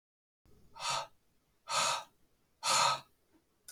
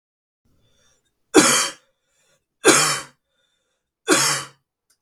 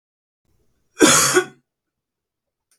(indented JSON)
{
  "exhalation_length": "3.7 s",
  "exhalation_amplitude": 4752,
  "exhalation_signal_mean_std_ratio": 0.41,
  "three_cough_length": "5.0 s",
  "three_cough_amplitude": 32713,
  "three_cough_signal_mean_std_ratio": 0.34,
  "cough_length": "2.8 s",
  "cough_amplitude": 32768,
  "cough_signal_mean_std_ratio": 0.31,
  "survey_phase": "beta (2021-08-13 to 2022-03-07)",
  "age": "45-64",
  "gender": "Male",
  "wearing_mask": "No",
  "symptom_cough_any": true,
  "symptom_runny_or_blocked_nose": true,
  "smoker_status": "Ex-smoker",
  "recruitment_source": "REACT",
  "submission_delay": "1 day",
  "covid_test_result": "Negative",
  "covid_test_method": "RT-qPCR",
  "influenza_a_test_result": "Negative",
  "influenza_b_test_result": "Negative"
}